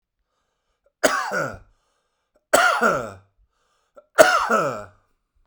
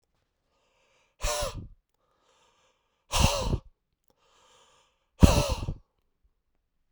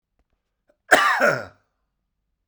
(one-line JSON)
{"three_cough_length": "5.5 s", "three_cough_amplitude": 32768, "three_cough_signal_mean_std_ratio": 0.39, "exhalation_length": "6.9 s", "exhalation_amplitude": 27088, "exhalation_signal_mean_std_ratio": 0.28, "cough_length": "2.5 s", "cough_amplitude": 32767, "cough_signal_mean_std_ratio": 0.34, "survey_phase": "beta (2021-08-13 to 2022-03-07)", "age": "45-64", "gender": "Male", "wearing_mask": "No", "symptom_cough_any": true, "symptom_runny_or_blocked_nose": true, "symptom_sore_throat": true, "symptom_headache": true, "symptom_change_to_sense_of_smell_or_taste": true, "symptom_onset": "3 days", "smoker_status": "Never smoked", "respiratory_condition_asthma": false, "respiratory_condition_other": false, "recruitment_source": "Test and Trace", "submission_delay": "2 days", "covid_test_result": "Positive", "covid_test_method": "RT-qPCR"}